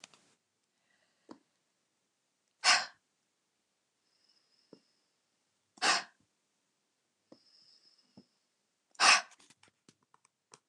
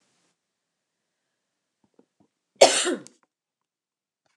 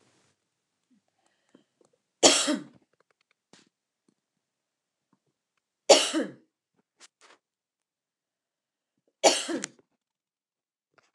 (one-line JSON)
{"exhalation_length": "10.7 s", "exhalation_amplitude": 12561, "exhalation_signal_mean_std_ratio": 0.19, "cough_length": "4.4 s", "cough_amplitude": 29204, "cough_signal_mean_std_ratio": 0.18, "three_cough_length": "11.1 s", "three_cough_amplitude": 26490, "three_cough_signal_mean_std_ratio": 0.2, "survey_phase": "beta (2021-08-13 to 2022-03-07)", "age": "45-64", "gender": "Female", "wearing_mask": "No", "symptom_none": true, "smoker_status": "Never smoked", "respiratory_condition_asthma": false, "respiratory_condition_other": false, "recruitment_source": "REACT", "submission_delay": "32 days", "covid_test_result": "Negative", "covid_test_method": "RT-qPCR"}